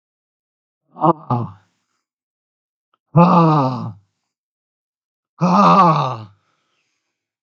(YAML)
exhalation_length: 7.4 s
exhalation_amplitude: 32768
exhalation_signal_mean_std_ratio: 0.39
survey_phase: beta (2021-08-13 to 2022-03-07)
age: 65+
gender: Male
wearing_mask: 'No'
symptom_none: true
symptom_onset: 12 days
smoker_status: Ex-smoker
respiratory_condition_asthma: false
respiratory_condition_other: false
recruitment_source: REACT
submission_delay: 2 days
covid_test_result: Negative
covid_test_method: RT-qPCR
influenza_a_test_result: Negative
influenza_b_test_result: Negative